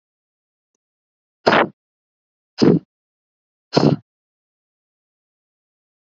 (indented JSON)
{
  "exhalation_length": "6.1 s",
  "exhalation_amplitude": 32768,
  "exhalation_signal_mean_std_ratio": 0.23,
  "survey_phase": "alpha (2021-03-01 to 2021-08-12)",
  "age": "18-44",
  "gender": "Female",
  "wearing_mask": "No",
  "symptom_none": true,
  "smoker_status": "Never smoked",
  "respiratory_condition_asthma": false,
  "respiratory_condition_other": false,
  "recruitment_source": "REACT",
  "submission_delay": "2 days",
  "covid_test_result": "Negative",
  "covid_test_method": "RT-qPCR"
}